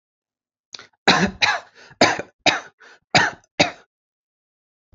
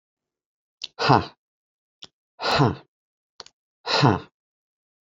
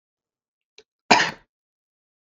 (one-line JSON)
{"three_cough_length": "4.9 s", "three_cough_amplitude": 29553, "three_cough_signal_mean_std_ratio": 0.34, "exhalation_length": "5.1 s", "exhalation_amplitude": 28413, "exhalation_signal_mean_std_ratio": 0.3, "cough_length": "2.3 s", "cough_amplitude": 30175, "cough_signal_mean_std_ratio": 0.21, "survey_phase": "alpha (2021-03-01 to 2021-08-12)", "age": "18-44", "gender": "Male", "wearing_mask": "No", "symptom_none": true, "smoker_status": "Never smoked", "respiratory_condition_asthma": false, "respiratory_condition_other": false, "recruitment_source": "REACT", "submission_delay": "3 days", "covid_test_result": "Negative", "covid_test_method": "RT-qPCR"}